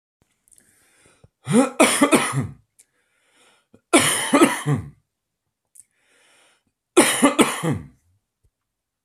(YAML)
three_cough_length: 9.0 s
three_cough_amplitude: 29712
three_cough_signal_mean_std_ratio: 0.38
survey_phase: alpha (2021-03-01 to 2021-08-12)
age: 45-64
gender: Male
wearing_mask: 'No'
symptom_cough_any: true
symptom_abdominal_pain: true
symptom_fatigue: true
symptom_fever_high_temperature: true
symptom_headache: true
symptom_onset: 3 days
smoker_status: Ex-smoker
respiratory_condition_asthma: false
respiratory_condition_other: false
recruitment_source: Test and Trace
submission_delay: 1 day
covid_test_result: Positive
covid_test_method: RT-qPCR
covid_ct_value: 19.3
covid_ct_gene: ORF1ab gene
covid_ct_mean: 19.8
covid_viral_load: 310000 copies/ml
covid_viral_load_category: Low viral load (10K-1M copies/ml)